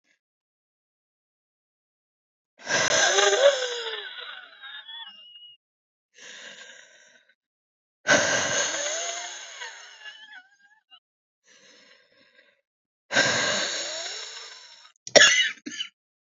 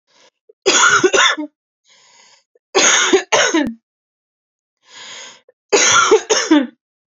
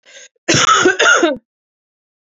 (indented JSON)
{
  "exhalation_length": "16.3 s",
  "exhalation_amplitude": 28987,
  "exhalation_signal_mean_std_ratio": 0.38,
  "three_cough_length": "7.2 s",
  "three_cough_amplitude": 32767,
  "three_cough_signal_mean_std_ratio": 0.5,
  "cough_length": "2.4 s",
  "cough_amplitude": 31992,
  "cough_signal_mean_std_ratio": 0.51,
  "survey_phase": "beta (2021-08-13 to 2022-03-07)",
  "age": "18-44",
  "gender": "Female",
  "wearing_mask": "No",
  "symptom_cough_any": true,
  "symptom_new_continuous_cough": true,
  "symptom_runny_or_blocked_nose": true,
  "symptom_shortness_of_breath": true,
  "symptom_sore_throat": true,
  "symptom_diarrhoea": true,
  "symptom_fatigue": true,
  "symptom_headache": true,
  "symptom_other": true,
  "symptom_onset": "3 days",
  "smoker_status": "Never smoked",
  "respiratory_condition_asthma": true,
  "respiratory_condition_other": false,
  "recruitment_source": "Test and Trace",
  "submission_delay": "1 day",
  "covid_test_result": "Positive",
  "covid_test_method": "RT-qPCR",
  "covid_ct_value": 16.1,
  "covid_ct_gene": "ORF1ab gene"
}